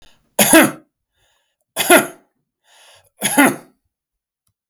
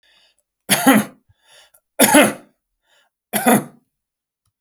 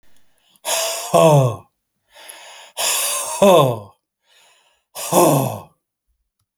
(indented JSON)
{
  "cough_length": "4.7 s",
  "cough_amplitude": 32768,
  "cough_signal_mean_std_ratio": 0.33,
  "three_cough_length": "4.6 s",
  "three_cough_amplitude": 32768,
  "three_cough_signal_mean_std_ratio": 0.35,
  "exhalation_length": "6.6 s",
  "exhalation_amplitude": 31184,
  "exhalation_signal_mean_std_ratio": 0.46,
  "survey_phase": "alpha (2021-03-01 to 2021-08-12)",
  "age": "45-64",
  "gender": "Male",
  "wearing_mask": "No",
  "symptom_none": true,
  "smoker_status": "Ex-smoker",
  "respiratory_condition_asthma": false,
  "respiratory_condition_other": false,
  "recruitment_source": "REACT",
  "submission_delay": "1 day",
  "covid_test_result": "Negative",
  "covid_test_method": "RT-qPCR"
}